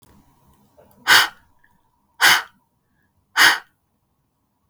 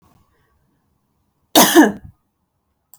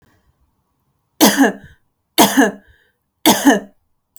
{"exhalation_length": "4.7 s", "exhalation_amplitude": 32768, "exhalation_signal_mean_std_ratio": 0.28, "cough_length": "3.0 s", "cough_amplitude": 32768, "cough_signal_mean_std_ratio": 0.27, "three_cough_length": "4.2 s", "three_cough_amplitude": 32768, "three_cough_signal_mean_std_ratio": 0.38, "survey_phase": "beta (2021-08-13 to 2022-03-07)", "age": "18-44", "gender": "Female", "wearing_mask": "No", "symptom_runny_or_blocked_nose": true, "symptom_onset": "5 days", "smoker_status": "Ex-smoker", "respiratory_condition_asthma": false, "respiratory_condition_other": false, "recruitment_source": "REACT", "submission_delay": "4 days", "covid_test_result": "Negative", "covid_test_method": "RT-qPCR", "influenza_a_test_result": "Negative", "influenza_b_test_result": "Negative"}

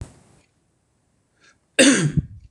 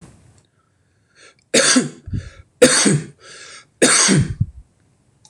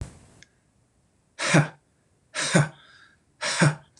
{"cough_length": "2.5 s", "cough_amplitude": 26027, "cough_signal_mean_std_ratio": 0.33, "three_cough_length": "5.3 s", "three_cough_amplitude": 26028, "three_cough_signal_mean_std_ratio": 0.43, "exhalation_length": "4.0 s", "exhalation_amplitude": 21530, "exhalation_signal_mean_std_ratio": 0.36, "survey_phase": "beta (2021-08-13 to 2022-03-07)", "age": "45-64", "gender": "Male", "wearing_mask": "No", "symptom_runny_or_blocked_nose": true, "symptom_headache": true, "symptom_loss_of_taste": true, "symptom_other": true, "smoker_status": "Never smoked", "respiratory_condition_asthma": false, "respiratory_condition_other": false, "recruitment_source": "Test and Trace", "submission_delay": "2 days", "covid_test_method": "RT-qPCR", "covid_ct_value": 23.0, "covid_ct_gene": "N gene"}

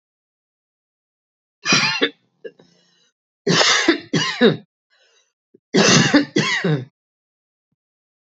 {"three_cough_length": "8.3 s", "three_cough_amplitude": 30777, "three_cough_signal_mean_std_ratio": 0.42, "survey_phase": "beta (2021-08-13 to 2022-03-07)", "age": "45-64", "gender": "Female", "wearing_mask": "No", "symptom_none": true, "smoker_status": "Ex-smoker", "respiratory_condition_asthma": false, "respiratory_condition_other": false, "recruitment_source": "REACT", "submission_delay": "4 days", "covid_test_result": "Negative", "covid_test_method": "RT-qPCR", "influenza_a_test_result": "Negative", "influenza_b_test_result": "Negative"}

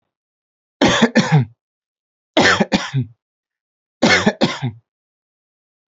{"three_cough_length": "5.9 s", "three_cough_amplitude": 30495, "three_cough_signal_mean_std_ratio": 0.41, "survey_phase": "beta (2021-08-13 to 2022-03-07)", "age": "18-44", "gender": "Male", "wearing_mask": "No", "symptom_none": true, "smoker_status": "Never smoked", "respiratory_condition_asthma": false, "respiratory_condition_other": false, "recruitment_source": "REACT", "submission_delay": "2 days", "covid_test_result": "Negative", "covid_test_method": "RT-qPCR", "influenza_a_test_result": "Unknown/Void", "influenza_b_test_result": "Unknown/Void"}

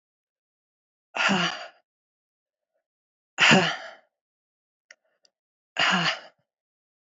{"exhalation_length": "7.1 s", "exhalation_amplitude": 19644, "exhalation_signal_mean_std_ratio": 0.31, "survey_phase": "alpha (2021-03-01 to 2021-08-12)", "age": "45-64", "gender": "Female", "wearing_mask": "No", "symptom_cough_any": true, "symptom_shortness_of_breath": true, "symptom_abdominal_pain": true, "symptom_fatigue": true, "symptom_headache": true, "symptom_change_to_sense_of_smell_or_taste": true, "symptom_loss_of_taste": true, "smoker_status": "Never smoked", "respiratory_condition_asthma": false, "respiratory_condition_other": false, "recruitment_source": "Test and Trace", "submission_delay": "1 day", "covid_test_result": "Positive", "covid_test_method": "ePCR"}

